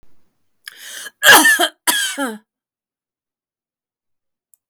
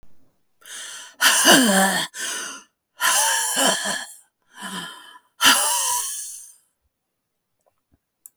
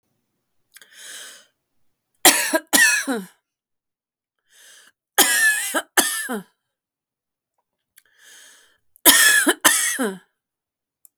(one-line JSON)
{"cough_length": "4.7 s", "cough_amplitude": 32768, "cough_signal_mean_std_ratio": 0.32, "exhalation_length": "8.4 s", "exhalation_amplitude": 32673, "exhalation_signal_mean_std_ratio": 0.5, "three_cough_length": "11.2 s", "three_cough_amplitude": 32768, "three_cough_signal_mean_std_ratio": 0.37, "survey_phase": "beta (2021-08-13 to 2022-03-07)", "age": "65+", "gender": "Female", "wearing_mask": "No", "symptom_cough_any": true, "symptom_runny_or_blocked_nose": true, "symptom_sore_throat": true, "symptom_fatigue": true, "symptom_onset": "3 days", "smoker_status": "Ex-smoker", "respiratory_condition_asthma": false, "respiratory_condition_other": false, "recruitment_source": "Test and Trace", "submission_delay": "1 day", "covid_test_result": "Positive", "covid_test_method": "ePCR"}